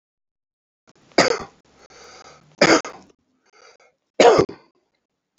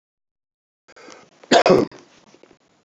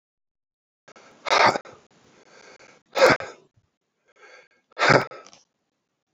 {"three_cough_length": "5.4 s", "three_cough_amplitude": 31725, "three_cough_signal_mean_std_ratio": 0.28, "cough_length": "2.9 s", "cough_amplitude": 28195, "cough_signal_mean_std_ratio": 0.27, "exhalation_length": "6.1 s", "exhalation_amplitude": 26974, "exhalation_signal_mean_std_ratio": 0.28, "survey_phase": "beta (2021-08-13 to 2022-03-07)", "age": "65+", "gender": "Male", "wearing_mask": "No", "symptom_cough_any": true, "symptom_onset": "9 days", "smoker_status": "Ex-smoker", "respiratory_condition_asthma": false, "respiratory_condition_other": false, "recruitment_source": "REACT", "submission_delay": "1 day", "covid_test_result": "Negative", "covid_test_method": "RT-qPCR", "influenza_a_test_result": "Negative", "influenza_b_test_result": "Negative"}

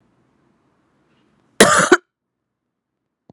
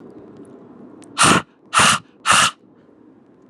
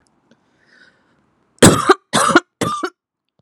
{"cough_length": "3.3 s", "cough_amplitude": 32768, "cough_signal_mean_std_ratio": 0.24, "exhalation_length": "3.5 s", "exhalation_amplitude": 31868, "exhalation_signal_mean_std_ratio": 0.41, "three_cough_length": "3.4 s", "three_cough_amplitude": 32768, "three_cough_signal_mean_std_ratio": 0.33, "survey_phase": "beta (2021-08-13 to 2022-03-07)", "age": "18-44", "gender": "Female", "wearing_mask": "No", "symptom_runny_or_blocked_nose": true, "symptom_fatigue": true, "symptom_headache": true, "symptom_change_to_sense_of_smell_or_taste": true, "symptom_loss_of_taste": true, "symptom_onset": "12 days", "smoker_status": "Current smoker (1 to 10 cigarettes per day)", "respiratory_condition_asthma": false, "respiratory_condition_other": false, "recruitment_source": "REACT", "submission_delay": "2 days", "covid_test_result": "Negative", "covid_test_method": "RT-qPCR", "influenza_a_test_result": "Negative", "influenza_b_test_result": "Negative"}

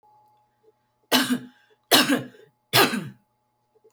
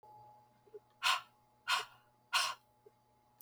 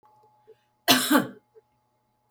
{"three_cough_length": "3.9 s", "three_cough_amplitude": 28109, "three_cough_signal_mean_std_ratio": 0.36, "exhalation_length": "3.4 s", "exhalation_amplitude": 3758, "exhalation_signal_mean_std_ratio": 0.35, "cough_length": "2.3 s", "cough_amplitude": 21547, "cough_signal_mean_std_ratio": 0.31, "survey_phase": "beta (2021-08-13 to 2022-03-07)", "age": "45-64", "gender": "Female", "wearing_mask": "No", "symptom_none": true, "smoker_status": "Never smoked", "respiratory_condition_asthma": false, "respiratory_condition_other": false, "recruitment_source": "REACT", "submission_delay": "1 day", "covid_test_result": "Negative", "covid_test_method": "RT-qPCR", "influenza_a_test_result": "Negative", "influenza_b_test_result": "Negative"}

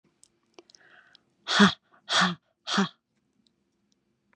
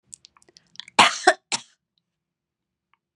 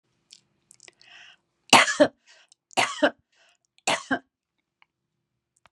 {"exhalation_length": "4.4 s", "exhalation_amplitude": 20759, "exhalation_signal_mean_std_ratio": 0.29, "cough_length": "3.2 s", "cough_amplitude": 31018, "cough_signal_mean_std_ratio": 0.21, "three_cough_length": "5.7 s", "three_cough_amplitude": 32768, "three_cough_signal_mean_std_ratio": 0.25, "survey_phase": "beta (2021-08-13 to 2022-03-07)", "age": "65+", "gender": "Female", "wearing_mask": "No", "symptom_none": true, "smoker_status": "Never smoked", "respiratory_condition_asthma": false, "respiratory_condition_other": false, "recruitment_source": "REACT", "submission_delay": "1 day", "covid_test_result": "Negative", "covid_test_method": "RT-qPCR", "influenza_a_test_result": "Negative", "influenza_b_test_result": "Negative"}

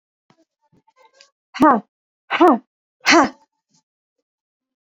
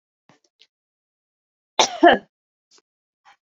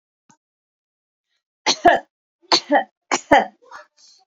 {"exhalation_length": "4.9 s", "exhalation_amplitude": 30487, "exhalation_signal_mean_std_ratio": 0.29, "cough_length": "3.6 s", "cough_amplitude": 28318, "cough_signal_mean_std_ratio": 0.2, "three_cough_length": "4.3 s", "three_cough_amplitude": 28816, "three_cough_signal_mean_std_ratio": 0.3, "survey_phase": "beta (2021-08-13 to 2022-03-07)", "age": "18-44", "gender": "Female", "wearing_mask": "No", "symptom_none": true, "smoker_status": "Ex-smoker", "respiratory_condition_asthma": false, "respiratory_condition_other": false, "recruitment_source": "REACT", "submission_delay": "1 day", "covid_test_result": "Negative", "covid_test_method": "RT-qPCR", "influenza_a_test_result": "Negative", "influenza_b_test_result": "Negative"}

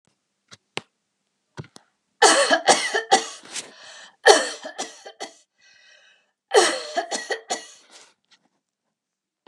{"three_cough_length": "9.5 s", "three_cough_amplitude": 32353, "three_cough_signal_mean_std_ratio": 0.33, "survey_phase": "beta (2021-08-13 to 2022-03-07)", "age": "45-64", "gender": "Female", "wearing_mask": "No", "symptom_none": true, "smoker_status": "Never smoked", "respiratory_condition_asthma": false, "respiratory_condition_other": false, "recruitment_source": "REACT", "submission_delay": "2 days", "covid_test_result": "Negative", "covid_test_method": "RT-qPCR", "influenza_a_test_result": "Negative", "influenza_b_test_result": "Negative"}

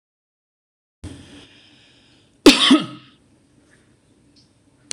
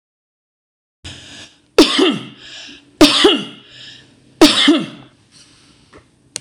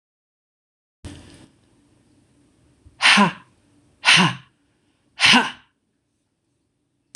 {"cough_length": "4.9 s", "cough_amplitude": 26028, "cough_signal_mean_std_ratio": 0.22, "three_cough_length": "6.4 s", "three_cough_amplitude": 26028, "three_cough_signal_mean_std_ratio": 0.37, "exhalation_length": "7.2 s", "exhalation_amplitude": 26028, "exhalation_signal_mean_std_ratio": 0.28, "survey_phase": "beta (2021-08-13 to 2022-03-07)", "age": "45-64", "gender": "Female", "wearing_mask": "No", "symptom_runny_or_blocked_nose": true, "symptom_sore_throat": true, "symptom_headache": true, "symptom_onset": "6 days", "smoker_status": "Never smoked", "respiratory_condition_asthma": false, "respiratory_condition_other": false, "recruitment_source": "REACT", "submission_delay": "1 day", "covid_test_result": "Negative", "covid_test_method": "RT-qPCR", "influenza_a_test_result": "Negative", "influenza_b_test_result": "Negative"}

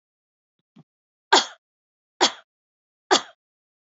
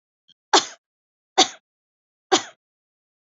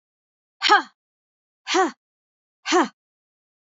{"three_cough_length": "3.9 s", "three_cough_amplitude": 27152, "three_cough_signal_mean_std_ratio": 0.2, "cough_length": "3.3 s", "cough_amplitude": 27648, "cough_signal_mean_std_ratio": 0.21, "exhalation_length": "3.7 s", "exhalation_amplitude": 22663, "exhalation_signal_mean_std_ratio": 0.3, "survey_phase": "beta (2021-08-13 to 2022-03-07)", "age": "45-64", "gender": "Female", "wearing_mask": "No", "symptom_none": true, "smoker_status": "Never smoked", "respiratory_condition_asthma": false, "respiratory_condition_other": false, "recruitment_source": "REACT", "submission_delay": "2 days", "covid_test_result": "Negative", "covid_test_method": "RT-qPCR", "influenza_a_test_result": "Unknown/Void", "influenza_b_test_result": "Unknown/Void"}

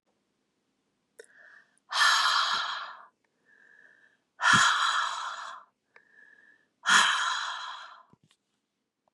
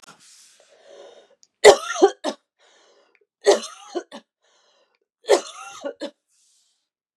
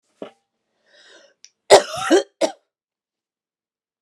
{"exhalation_length": "9.1 s", "exhalation_amplitude": 13597, "exhalation_signal_mean_std_ratio": 0.43, "three_cough_length": "7.2 s", "three_cough_amplitude": 32768, "three_cough_signal_mean_std_ratio": 0.23, "cough_length": "4.0 s", "cough_amplitude": 32768, "cough_signal_mean_std_ratio": 0.23, "survey_phase": "beta (2021-08-13 to 2022-03-07)", "age": "18-44", "gender": "Female", "wearing_mask": "No", "symptom_cough_any": true, "symptom_runny_or_blocked_nose": true, "symptom_other": true, "smoker_status": "Ex-smoker", "respiratory_condition_asthma": false, "respiratory_condition_other": false, "recruitment_source": "Test and Trace", "submission_delay": "2 days", "covid_test_result": "Positive", "covid_test_method": "LFT"}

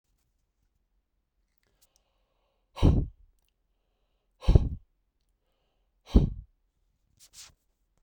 {"exhalation_length": "8.0 s", "exhalation_amplitude": 18480, "exhalation_signal_mean_std_ratio": 0.2, "survey_phase": "beta (2021-08-13 to 2022-03-07)", "age": "45-64", "gender": "Male", "wearing_mask": "No", "symptom_sore_throat": true, "symptom_other": true, "symptom_onset": "11 days", "smoker_status": "Never smoked", "respiratory_condition_asthma": false, "respiratory_condition_other": false, "recruitment_source": "REACT", "submission_delay": "2 days", "covid_test_result": "Negative", "covid_test_method": "RT-qPCR"}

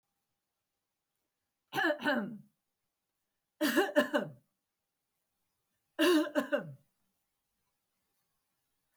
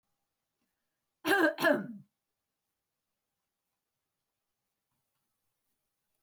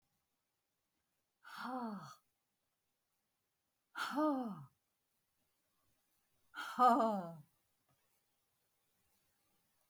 {"three_cough_length": "9.0 s", "three_cough_amplitude": 6465, "three_cough_signal_mean_std_ratio": 0.33, "cough_length": "6.2 s", "cough_amplitude": 6733, "cough_signal_mean_std_ratio": 0.23, "exhalation_length": "9.9 s", "exhalation_amplitude": 3924, "exhalation_signal_mean_std_ratio": 0.29, "survey_phase": "beta (2021-08-13 to 2022-03-07)", "age": "45-64", "gender": "Female", "wearing_mask": "No", "symptom_none": true, "smoker_status": "Never smoked", "respiratory_condition_asthma": false, "respiratory_condition_other": false, "recruitment_source": "REACT", "submission_delay": "1 day", "covid_test_result": "Negative", "covid_test_method": "RT-qPCR", "influenza_a_test_result": "Negative", "influenza_b_test_result": "Negative"}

